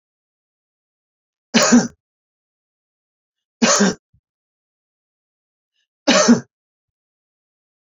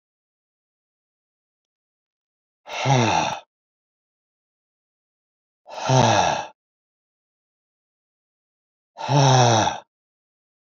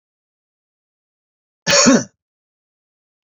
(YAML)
three_cough_length: 7.9 s
three_cough_amplitude: 29722
three_cough_signal_mean_std_ratio: 0.27
exhalation_length: 10.7 s
exhalation_amplitude: 25300
exhalation_signal_mean_std_ratio: 0.34
cough_length: 3.2 s
cough_amplitude: 30240
cough_signal_mean_std_ratio: 0.27
survey_phase: beta (2021-08-13 to 2022-03-07)
age: 65+
gender: Male
wearing_mask: 'No'
symptom_none: true
smoker_status: Ex-smoker
respiratory_condition_asthma: false
respiratory_condition_other: false
recruitment_source: REACT
submission_delay: 2 days
covid_test_result: Negative
covid_test_method: RT-qPCR